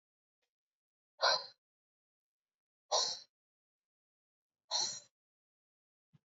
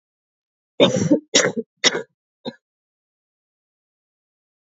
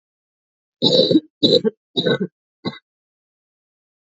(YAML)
exhalation_length: 6.3 s
exhalation_amplitude: 4374
exhalation_signal_mean_std_ratio: 0.25
cough_length: 4.8 s
cough_amplitude: 32268
cough_signal_mean_std_ratio: 0.29
three_cough_length: 4.2 s
three_cough_amplitude: 29320
three_cough_signal_mean_std_ratio: 0.36
survey_phase: beta (2021-08-13 to 2022-03-07)
age: 18-44
gender: Female
wearing_mask: 'No'
symptom_cough_any: true
symptom_runny_or_blocked_nose: true
symptom_fatigue: true
symptom_change_to_sense_of_smell_or_taste: true
symptom_onset: 11 days
smoker_status: Current smoker (1 to 10 cigarettes per day)
respiratory_condition_asthma: false
respiratory_condition_other: false
recruitment_source: Test and Trace
submission_delay: 3 days
covid_test_result: Positive
covid_test_method: RT-qPCR
covid_ct_value: 29.7
covid_ct_gene: N gene